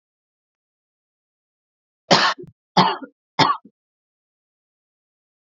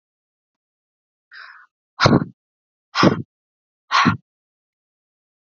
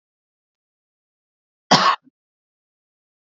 {"three_cough_length": "5.5 s", "three_cough_amplitude": 32767, "three_cough_signal_mean_std_ratio": 0.25, "exhalation_length": "5.5 s", "exhalation_amplitude": 32767, "exhalation_signal_mean_std_ratio": 0.27, "cough_length": "3.3 s", "cough_amplitude": 32767, "cough_signal_mean_std_ratio": 0.2, "survey_phase": "beta (2021-08-13 to 2022-03-07)", "age": "18-44", "gender": "Female", "wearing_mask": "No", "symptom_none": true, "smoker_status": "Never smoked", "respiratory_condition_asthma": false, "respiratory_condition_other": false, "recruitment_source": "REACT", "submission_delay": "0 days", "covid_test_result": "Negative", "covid_test_method": "RT-qPCR"}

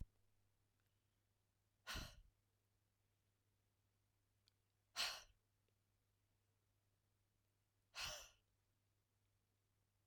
{"exhalation_length": "10.1 s", "exhalation_amplitude": 898, "exhalation_signal_mean_std_ratio": 0.25, "survey_phase": "alpha (2021-03-01 to 2021-08-12)", "age": "45-64", "gender": "Female", "wearing_mask": "No", "symptom_fatigue": true, "symptom_onset": "12 days", "smoker_status": "Never smoked", "respiratory_condition_asthma": true, "respiratory_condition_other": false, "recruitment_source": "REACT", "submission_delay": "2 days", "covid_test_result": "Negative", "covid_test_method": "RT-qPCR"}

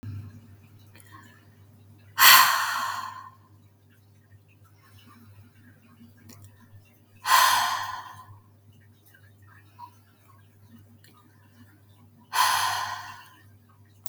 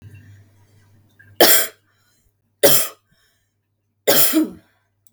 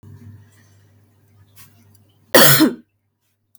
{"exhalation_length": "14.1 s", "exhalation_amplitude": 32348, "exhalation_signal_mean_std_ratio": 0.31, "three_cough_length": "5.1 s", "three_cough_amplitude": 32768, "three_cough_signal_mean_std_ratio": 0.34, "cough_length": "3.6 s", "cough_amplitude": 32768, "cough_signal_mean_std_ratio": 0.28, "survey_phase": "beta (2021-08-13 to 2022-03-07)", "age": "18-44", "gender": "Female", "wearing_mask": "No", "symptom_none": true, "smoker_status": "Ex-smoker", "respiratory_condition_asthma": false, "respiratory_condition_other": false, "recruitment_source": "REACT", "submission_delay": "1 day", "covid_test_result": "Negative", "covid_test_method": "RT-qPCR", "influenza_a_test_result": "Unknown/Void", "influenza_b_test_result": "Unknown/Void"}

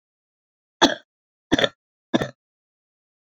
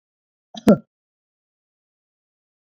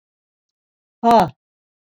{"three_cough_length": "3.3 s", "three_cough_amplitude": 32768, "three_cough_signal_mean_std_ratio": 0.23, "cough_length": "2.6 s", "cough_amplitude": 25393, "cough_signal_mean_std_ratio": 0.16, "exhalation_length": "2.0 s", "exhalation_amplitude": 24620, "exhalation_signal_mean_std_ratio": 0.29, "survey_phase": "beta (2021-08-13 to 2022-03-07)", "age": "65+", "gender": "Female", "wearing_mask": "No", "symptom_none": true, "smoker_status": "Never smoked", "respiratory_condition_asthma": false, "respiratory_condition_other": false, "recruitment_source": "REACT", "submission_delay": "2 days", "covid_test_result": "Negative", "covid_test_method": "RT-qPCR", "influenza_a_test_result": "Negative", "influenza_b_test_result": "Negative"}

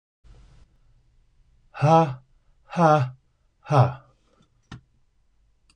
{"exhalation_length": "5.8 s", "exhalation_amplitude": 19386, "exhalation_signal_mean_std_ratio": 0.32, "survey_phase": "beta (2021-08-13 to 2022-03-07)", "age": "65+", "gender": "Male", "wearing_mask": "No", "symptom_cough_any": true, "smoker_status": "Never smoked", "respiratory_condition_asthma": false, "respiratory_condition_other": false, "recruitment_source": "REACT", "submission_delay": "1 day", "covid_test_result": "Negative", "covid_test_method": "RT-qPCR", "influenza_a_test_result": "Unknown/Void", "influenza_b_test_result": "Unknown/Void"}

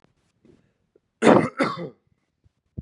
{"exhalation_length": "2.8 s", "exhalation_amplitude": 31805, "exhalation_signal_mean_std_ratio": 0.29, "survey_phase": "beta (2021-08-13 to 2022-03-07)", "age": "18-44", "gender": "Male", "wearing_mask": "No", "symptom_cough_any": true, "symptom_new_continuous_cough": true, "symptom_sore_throat": true, "symptom_onset": "3 days", "smoker_status": "Never smoked", "respiratory_condition_asthma": false, "respiratory_condition_other": false, "recruitment_source": "Test and Trace", "submission_delay": "2 days", "covid_test_result": "Positive", "covid_test_method": "RT-qPCR", "covid_ct_value": 18.2, "covid_ct_gene": "N gene", "covid_ct_mean": 19.1, "covid_viral_load": "560000 copies/ml", "covid_viral_load_category": "Low viral load (10K-1M copies/ml)"}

